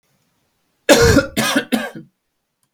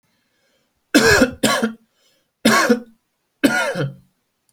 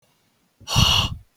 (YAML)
cough_length: 2.7 s
cough_amplitude: 31857
cough_signal_mean_std_ratio: 0.42
three_cough_length: 4.5 s
three_cough_amplitude: 30091
three_cough_signal_mean_std_ratio: 0.45
exhalation_length: 1.4 s
exhalation_amplitude: 25738
exhalation_signal_mean_std_ratio: 0.46
survey_phase: alpha (2021-03-01 to 2021-08-12)
age: 18-44
gender: Male
wearing_mask: 'No'
symptom_none: true
smoker_status: Current smoker (1 to 10 cigarettes per day)
respiratory_condition_asthma: false
respiratory_condition_other: false
recruitment_source: REACT
submission_delay: 2 days
covid_test_result: Negative
covid_test_method: RT-qPCR
covid_ct_value: 40.0
covid_ct_gene: N gene